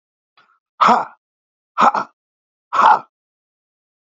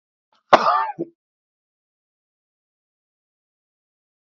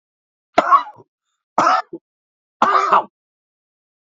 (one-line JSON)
{"exhalation_length": "4.1 s", "exhalation_amplitude": 28264, "exhalation_signal_mean_std_ratio": 0.32, "cough_length": "4.3 s", "cough_amplitude": 27658, "cough_signal_mean_std_ratio": 0.2, "three_cough_length": "4.2 s", "three_cough_amplitude": 30911, "three_cough_signal_mean_std_ratio": 0.36, "survey_phase": "beta (2021-08-13 to 2022-03-07)", "age": "65+", "gender": "Male", "wearing_mask": "No", "symptom_none": true, "smoker_status": "Never smoked", "respiratory_condition_asthma": false, "respiratory_condition_other": false, "recruitment_source": "REACT", "submission_delay": "2 days", "covid_test_result": "Negative", "covid_test_method": "RT-qPCR", "influenza_a_test_result": "Negative", "influenza_b_test_result": "Negative"}